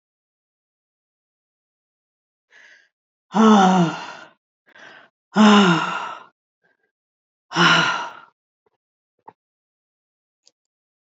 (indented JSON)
{
  "exhalation_length": "11.2 s",
  "exhalation_amplitude": 27744,
  "exhalation_signal_mean_std_ratio": 0.32,
  "survey_phase": "beta (2021-08-13 to 2022-03-07)",
  "age": "65+",
  "gender": "Female",
  "wearing_mask": "No",
  "symptom_new_continuous_cough": true,
  "symptom_runny_or_blocked_nose": true,
  "symptom_shortness_of_breath": true,
  "symptom_headache": true,
  "symptom_onset": "3 days",
  "smoker_status": "Never smoked",
  "respiratory_condition_asthma": false,
  "respiratory_condition_other": false,
  "recruitment_source": "Test and Trace",
  "submission_delay": "1 day",
  "covid_test_result": "Positive",
  "covid_test_method": "RT-qPCR",
  "covid_ct_value": 19.9,
  "covid_ct_gene": "ORF1ab gene",
  "covid_ct_mean": 20.4,
  "covid_viral_load": "200000 copies/ml",
  "covid_viral_load_category": "Low viral load (10K-1M copies/ml)"
}